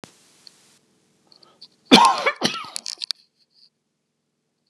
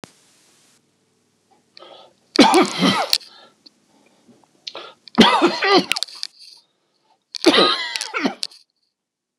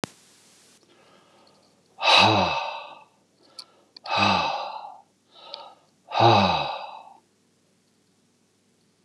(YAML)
cough_length: 4.7 s
cough_amplitude: 32767
cough_signal_mean_std_ratio: 0.25
three_cough_length: 9.4 s
three_cough_amplitude: 32768
three_cough_signal_mean_std_ratio: 0.36
exhalation_length: 9.0 s
exhalation_amplitude: 24130
exhalation_signal_mean_std_ratio: 0.38
survey_phase: beta (2021-08-13 to 2022-03-07)
age: 65+
gender: Male
wearing_mask: 'No'
symptom_none: true
smoker_status: Never smoked
respiratory_condition_asthma: false
respiratory_condition_other: false
recruitment_source: REACT
submission_delay: 2 days
covid_test_result: Negative
covid_test_method: RT-qPCR
influenza_a_test_result: Negative
influenza_b_test_result: Negative